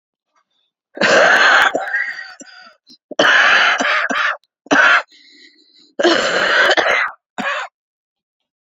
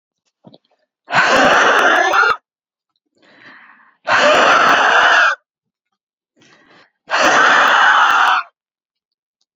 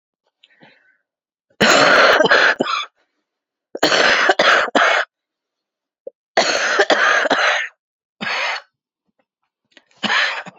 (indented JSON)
{
  "cough_length": "8.6 s",
  "cough_amplitude": 31317,
  "cough_signal_mean_std_ratio": 0.58,
  "exhalation_length": "9.6 s",
  "exhalation_amplitude": 31023,
  "exhalation_signal_mean_std_ratio": 0.58,
  "three_cough_length": "10.6 s",
  "three_cough_amplitude": 32767,
  "three_cough_signal_mean_std_ratio": 0.52,
  "survey_phase": "beta (2021-08-13 to 2022-03-07)",
  "age": "18-44",
  "gender": "Female",
  "wearing_mask": "Yes",
  "symptom_cough_any": true,
  "symptom_new_continuous_cough": true,
  "symptom_shortness_of_breath": true,
  "symptom_sore_throat": true,
  "symptom_abdominal_pain": true,
  "symptom_diarrhoea": true,
  "symptom_fatigue": true,
  "symptom_headache": true,
  "symptom_change_to_sense_of_smell_or_taste": true,
  "symptom_loss_of_taste": true,
  "symptom_onset": "4 days",
  "smoker_status": "Current smoker (1 to 10 cigarettes per day)",
  "respiratory_condition_asthma": false,
  "respiratory_condition_other": false,
  "recruitment_source": "Test and Trace",
  "submission_delay": "2 days",
  "covid_test_result": "Positive",
  "covid_test_method": "RT-qPCR",
  "covid_ct_value": 21.1,
  "covid_ct_gene": "ORF1ab gene",
  "covid_ct_mean": 22.0,
  "covid_viral_load": "59000 copies/ml",
  "covid_viral_load_category": "Low viral load (10K-1M copies/ml)"
}